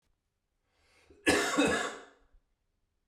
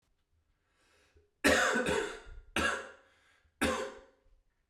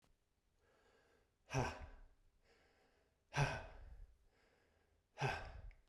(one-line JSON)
{"cough_length": "3.1 s", "cough_amplitude": 9330, "cough_signal_mean_std_ratio": 0.38, "three_cough_length": "4.7 s", "three_cough_amplitude": 10560, "three_cough_signal_mean_std_ratio": 0.43, "exhalation_length": "5.9 s", "exhalation_amplitude": 1738, "exhalation_signal_mean_std_ratio": 0.35, "survey_phase": "beta (2021-08-13 to 2022-03-07)", "age": "18-44", "gender": "Male", "wearing_mask": "No", "symptom_cough_any": true, "symptom_runny_or_blocked_nose": true, "symptom_fatigue": true, "symptom_fever_high_temperature": true, "symptom_headache": true, "symptom_onset": "4 days", "smoker_status": "Ex-smoker", "respiratory_condition_asthma": false, "respiratory_condition_other": false, "recruitment_source": "Test and Trace", "submission_delay": "2 days", "covid_test_result": "Positive", "covid_test_method": "ePCR"}